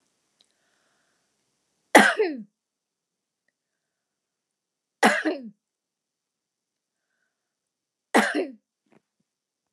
{"three_cough_length": "9.7 s", "three_cough_amplitude": 29203, "three_cough_signal_mean_std_ratio": 0.22, "survey_phase": "beta (2021-08-13 to 2022-03-07)", "age": "65+", "gender": "Female", "wearing_mask": "No", "symptom_none": true, "smoker_status": "Never smoked", "respiratory_condition_asthma": false, "respiratory_condition_other": false, "recruitment_source": "REACT", "submission_delay": "1 day", "covid_test_result": "Negative", "covid_test_method": "RT-qPCR"}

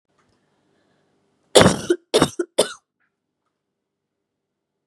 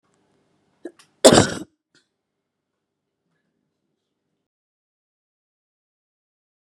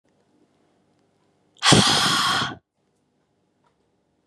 {"three_cough_length": "4.9 s", "three_cough_amplitude": 32768, "three_cough_signal_mean_std_ratio": 0.24, "cough_length": "6.7 s", "cough_amplitude": 32768, "cough_signal_mean_std_ratio": 0.14, "exhalation_length": "4.3 s", "exhalation_amplitude": 29122, "exhalation_signal_mean_std_ratio": 0.36, "survey_phase": "beta (2021-08-13 to 2022-03-07)", "age": "18-44", "gender": "Female", "wearing_mask": "No", "symptom_none": true, "smoker_status": "Never smoked", "respiratory_condition_asthma": false, "respiratory_condition_other": false, "recruitment_source": "REACT", "submission_delay": "3 days", "covid_test_result": "Negative", "covid_test_method": "RT-qPCR", "covid_ct_value": 37.6, "covid_ct_gene": "N gene", "influenza_a_test_result": "Negative", "influenza_b_test_result": "Negative"}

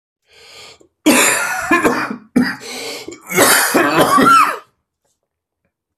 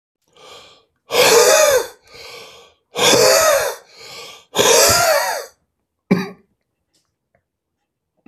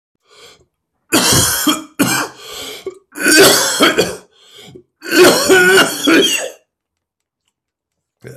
{"cough_length": "6.0 s", "cough_amplitude": 32768, "cough_signal_mean_std_ratio": 0.57, "exhalation_length": "8.3 s", "exhalation_amplitude": 32768, "exhalation_signal_mean_std_ratio": 0.48, "three_cough_length": "8.4 s", "three_cough_amplitude": 32768, "three_cough_signal_mean_std_ratio": 0.53, "survey_phase": "alpha (2021-03-01 to 2021-08-12)", "age": "45-64", "gender": "Male", "wearing_mask": "No", "symptom_cough_any": true, "symptom_onset": "4 days", "smoker_status": "Ex-smoker", "respiratory_condition_asthma": false, "respiratory_condition_other": false, "recruitment_source": "Test and Trace", "submission_delay": "2 days", "covid_test_result": "Positive", "covid_test_method": "RT-qPCR", "covid_ct_value": 23.1, "covid_ct_gene": "ORF1ab gene"}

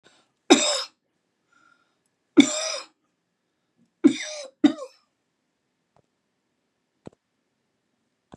{"three_cough_length": "8.4 s", "three_cough_amplitude": 32193, "three_cough_signal_mean_std_ratio": 0.22, "survey_phase": "beta (2021-08-13 to 2022-03-07)", "age": "65+", "gender": "Female", "wearing_mask": "No", "symptom_none": true, "smoker_status": "Never smoked", "respiratory_condition_asthma": false, "respiratory_condition_other": false, "recruitment_source": "REACT", "submission_delay": "2 days", "covid_test_result": "Negative", "covid_test_method": "RT-qPCR", "influenza_a_test_result": "Negative", "influenza_b_test_result": "Negative"}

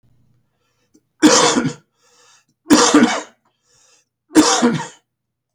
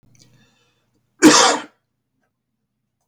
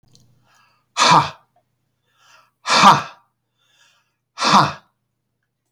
{"three_cough_length": "5.5 s", "three_cough_amplitude": 32688, "three_cough_signal_mean_std_ratio": 0.41, "cough_length": "3.1 s", "cough_amplitude": 30243, "cough_signal_mean_std_ratio": 0.27, "exhalation_length": "5.7 s", "exhalation_amplitude": 32694, "exhalation_signal_mean_std_ratio": 0.32, "survey_phase": "beta (2021-08-13 to 2022-03-07)", "age": "65+", "gender": "Male", "wearing_mask": "No", "symptom_cough_any": true, "symptom_loss_of_taste": true, "smoker_status": "Never smoked", "respiratory_condition_asthma": false, "respiratory_condition_other": false, "recruitment_source": "Test and Trace", "submission_delay": "2 days", "covid_test_result": "Positive", "covid_test_method": "RT-qPCR", "covid_ct_value": 17.3, "covid_ct_gene": "ORF1ab gene", "covid_ct_mean": 17.6, "covid_viral_load": "1700000 copies/ml", "covid_viral_load_category": "High viral load (>1M copies/ml)"}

